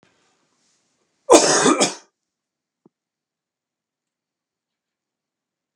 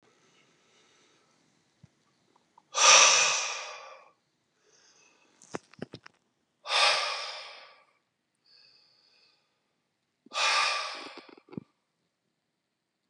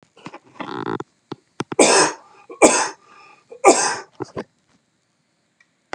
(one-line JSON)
{"cough_length": "5.8 s", "cough_amplitude": 32768, "cough_signal_mean_std_ratio": 0.24, "exhalation_length": "13.1 s", "exhalation_amplitude": 19372, "exhalation_signal_mean_std_ratio": 0.3, "three_cough_length": "5.9 s", "three_cough_amplitude": 32768, "three_cough_signal_mean_std_ratio": 0.34, "survey_phase": "beta (2021-08-13 to 2022-03-07)", "age": "65+", "gender": "Male", "wearing_mask": "No", "symptom_cough_any": true, "smoker_status": "Never smoked", "respiratory_condition_asthma": false, "respiratory_condition_other": false, "recruitment_source": "REACT", "submission_delay": "1 day", "covid_test_result": "Negative", "covid_test_method": "RT-qPCR"}